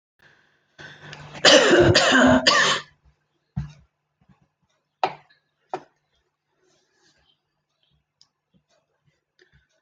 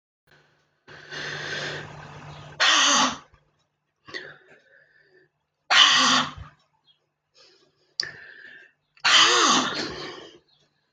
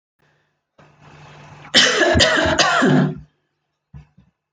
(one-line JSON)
{"three_cough_length": "9.8 s", "three_cough_amplitude": 27531, "three_cough_signal_mean_std_ratio": 0.32, "exhalation_length": "10.9 s", "exhalation_amplitude": 25896, "exhalation_signal_mean_std_ratio": 0.4, "cough_length": "4.5 s", "cough_amplitude": 31455, "cough_signal_mean_std_ratio": 0.49, "survey_phase": "alpha (2021-03-01 to 2021-08-12)", "age": "65+", "gender": "Female", "wearing_mask": "No", "symptom_none": true, "smoker_status": "Never smoked", "respiratory_condition_asthma": false, "respiratory_condition_other": false, "recruitment_source": "REACT", "submission_delay": "2 days", "covid_test_result": "Negative", "covid_test_method": "RT-qPCR"}